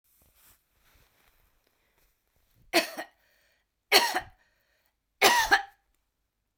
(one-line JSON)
{"three_cough_length": "6.6 s", "three_cough_amplitude": 19521, "three_cough_signal_mean_std_ratio": 0.26, "survey_phase": "beta (2021-08-13 to 2022-03-07)", "age": "65+", "gender": "Female", "wearing_mask": "No", "symptom_cough_any": true, "smoker_status": "Ex-smoker", "respiratory_condition_asthma": false, "respiratory_condition_other": true, "recruitment_source": "Test and Trace", "submission_delay": "1 day", "covid_test_result": "Positive", "covid_test_method": "RT-qPCR", "covid_ct_value": 16.8, "covid_ct_gene": "ORF1ab gene", "covid_ct_mean": 16.9, "covid_viral_load": "2900000 copies/ml", "covid_viral_load_category": "High viral load (>1M copies/ml)"}